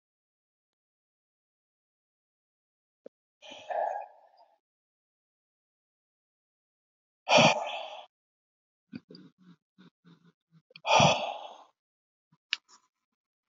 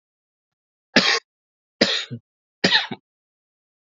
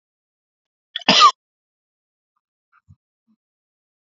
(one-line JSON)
{"exhalation_length": "13.5 s", "exhalation_amplitude": 12693, "exhalation_signal_mean_std_ratio": 0.23, "three_cough_length": "3.8 s", "three_cough_amplitude": 31109, "three_cough_signal_mean_std_ratio": 0.31, "cough_length": "4.1 s", "cough_amplitude": 29168, "cough_signal_mean_std_ratio": 0.19, "survey_phase": "alpha (2021-03-01 to 2021-08-12)", "age": "18-44", "gender": "Male", "wearing_mask": "No", "symptom_none": true, "smoker_status": "Never smoked", "respiratory_condition_asthma": false, "respiratory_condition_other": false, "recruitment_source": "Test and Trace", "submission_delay": "2 days", "covid_test_result": "Positive", "covid_test_method": "RT-qPCR", "covid_ct_value": 28.9, "covid_ct_gene": "ORF1ab gene"}